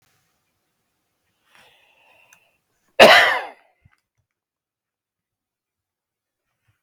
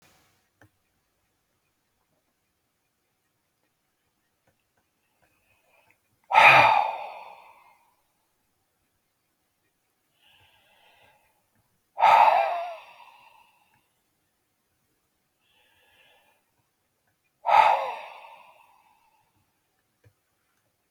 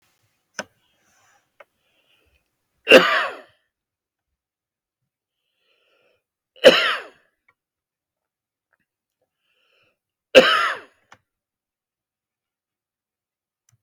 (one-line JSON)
{"cough_length": "6.8 s", "cough_amplitude": 32768, "cough_signal_mean_std_ratio": 0.18, "exhalation_length": "20.9 s", "exhalation_amplitude": 25961, "exhalation_signal_mean_std_ratio": 0.23, "three_cough_length": "13.8 s", "three_cough_amplitude": 32768, "three_cough_signal_mean_std_ratio": 0.19, "survey_phase": "beta (2021-08-13 to 2022-03-07)", "age": "65+", "gender": "Male", "wearing_mask": "No", "symptom_none": true, "smoker_status": "Ex-smoker", "respiratory_condition_asthma": false, "respiratory_condition_other": false, "recruitment_source": "REACT", "submission_delay": "1 day", "covid_test_result": "Negative", "covid_test_method": "RT-qPCR", "influenza_a_test_result": "Negative", "influenza_b_test_result": "Negative"}